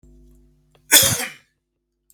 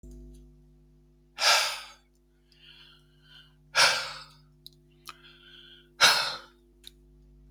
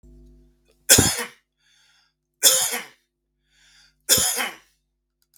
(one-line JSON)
{"cough_length": "2.1 s", "cough_amplitude": 32768, "cough_signal_mean_std_ratio": 0.29, "exhalation_length": "7.5 s", "exhalation_amplitude": 17758, "exhalation_signal_mean_std_ratio": 0.32, "three_cough_length": "5.4 s", "three_cough_amplitude": 32768, "three_cough_signal_mean_std_ratio": 0.33, "survey_phase": "beta (2021-08-13 to 2022-03-07)", "age": "65+", "gender": "Male", "wearing_mask": "No", "symptom_none": true, "smoker_status": "Ex-smoker", "respiratory_condition_asthma": false, "respiratory_condition_other": false, "recruitment_source": "REACT", "submission_delay": "1 day", "covid_test_result": "Negative", "covid_test_method": "RT-qPCR", "influenza_a_test_result": "Negative", "influenza_b_test_result": "Negative"}